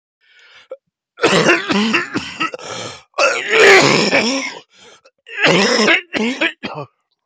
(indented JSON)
{
  "cough_length": "7.3 s",
  "cough_amplitude": 32768,
  "cough_signal_mean_std_ratio": 0.59,
  "survey_phase": "beta (2021-08-13 to 2022-03-07)",
  "age": "45-64",
  "gender": "Male",
  "wearing_mask": "No",
  "symptom_cough_any": true,
  "symptom_new_continuous_cough": true,
  "symptom_runny_or_blocked_nose": true,
  "symptom_shortness_of_breath": true,
  "symptom_sore_throat": true,
  "symptom_diarrhoea": true,
  "symptom_fever_high_temperature": true,
  "symptom_headache": true,
  "symptom_change_to_sense_of_smell_or_taste": true,
  "symptom_loss_of_taste": true,
  "symptom_onset": "8 days",
  "smoker_status": "Never smoked",
  "respiratory_condition_asthma": true,
  "respiratory_condition_other": false,
  "recruitment_source": "Test and Trace",
  "submission_delay": "1 day",
  "covid_test_result": "Negative",
  "covid_test_method": "RT-qPCR"
}